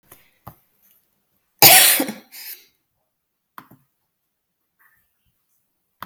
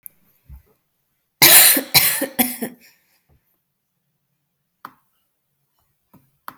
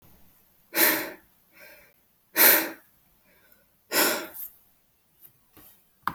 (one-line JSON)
{"cough_length": "6.1 s", "cough_amplitude": 32768, "cough_signal_mean_std_ratio": 0.22, "three_cough_length": "6.6 s", "three_cough_amplitude": 32768, "three_cough_signal_mean_std_ratio": 0.27, "exhalation_length": "6.1 s", "exhalation_amplitude": 19852, "exhalation_signal_mean_std_ratio": 0.32, "survey_phase": "alpha (2021-03-01 to 2021-08-12)", "age": "18-44", "gender": "Female", "wearing_mask": "No", "symptom_none": true, "smoker_status": "Ex-smoker", "respiratory_condition_asthma": false, "respiratory_condition_other": false, "recruitment_source": "REACT", "submission_delay": "1 day", "covid_test_result": "Negative", "covid_test_method": "RT-qPCR"}